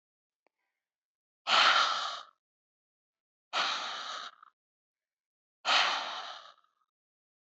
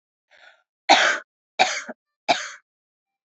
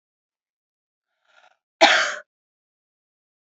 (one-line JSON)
{"exhalation_length": "7.6 s", "exhalation_amplitude": 8733, "exhalation_signal_mean_std_ratio": 0.37, "three_cough_length": "3.2 s", "three_cough_amplitude": 32216, "three_cough_signal_mean_std_ratio": 0.32, "cough_length": "3.4 s", "cough_amplitude": 28028, "cough_signal_mean_std_ratio": 0.23, "survey_phase": "beta (2021-08-13 to 2022-03-07)", "age": "18-44", "gender": "Female", "wearing_mask": "No", "symptom_runny_or_blocked_nose": true, "smoker_status": "Never smoked", "respiratory_condition_asthma": false, "respiratory_condition_other": false, "recruitment_source": "Test and Trace", "submission_delay": "0 days", "covid_test_result": "Positive", "covid_test_method": "LFT"}